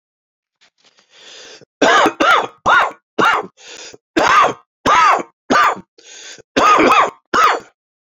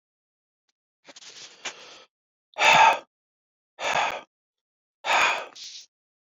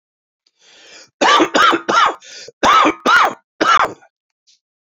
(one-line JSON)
{"three_cough_length": "8.2 s", "three_cough_amplitude": 32768, "three_cough_signal_mean_std_ratio": 0.53, "exhalation_length": "6.2 s", "exhalation_amplitude": 22540, "exhalation_signal_mean_std_ratio": 0.34, "cough_length": "4.9 s", "cough_amplitude": 32065, "cough_signal_mean_std_ratio": 0.51, "survey_phase": "alpha (2021-03-01 to 2021-08-12)", "age": "45-64", "gender": "Male", "wearing_mask": "No", "symptom_new_continuous_cough": true, "symptom_headache": true, "symptom_change_to_sense_of_smell_or_taste": true, "symptom_onset": "5 days", "smoker_status": "Ex-smoker", "respiratory_condition_asthma": false, "respiratory_condition_other": false, "recruitment_source": "Test and Trace", "submission_delay": "2 days", "covid_test_result": "Positive", "covid_test_method": "RT-qPCR"}